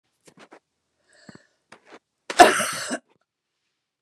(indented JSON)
{
  "cough_length": "4.0 s",
  "cough_amplitude": 29204,
  "cough_signal_mean_std_ratio": 0.21,
  "survey_phase": "beta (2021-08-13 to 2022-03-07)",
  "age": "65+",
  "gender": "Female",
  "wearing_mask": "No",
  "symptom_none": true,
  "smoker_status": "Never smoked",
  "respiratory_condition_asthma": false,
  "respiratory_condition_other": false,
  "recruitment_source": "REACT",
  "submission_delay": "3 days",
  "covid_test_result": "Negative",
  "covid_test_method": "RT-qPCR",
  "influenza_a_test_result": "Negative",
  "influenza_b_test_result": "Negative"
}